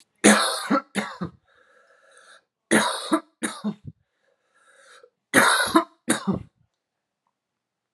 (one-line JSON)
{"three_cough_length": "7.9 s", "three_cough_amplitude": 30557, "three_cough_signal_mean_std_ratio": 0.37, "survey_phase": "alpha (2021-03-01 to 2021-08-12)", "age": "18-44", "gender": "Male", "wearing_mask": "No", "symptom_fatigue": true, "symptom_onset": "3 days", "smoker_status": "Never smoked", "respiratory_condition_asthma": false, "respiratory_condition_other": false, "recruitment_source": "Test and Trace", "submission_delay": "1 day", "covid_test_result": "Positive", "covid_test_method": "RT-qPCR", "covid_ct_value": 13.1, "covid_ct_gene": "N gene", "covid_ct_mean": 13.6, "covid_viral_load": "35000000 copies/ml", "covid_viral_load_category": "High viral load (>1M copies/ml)"}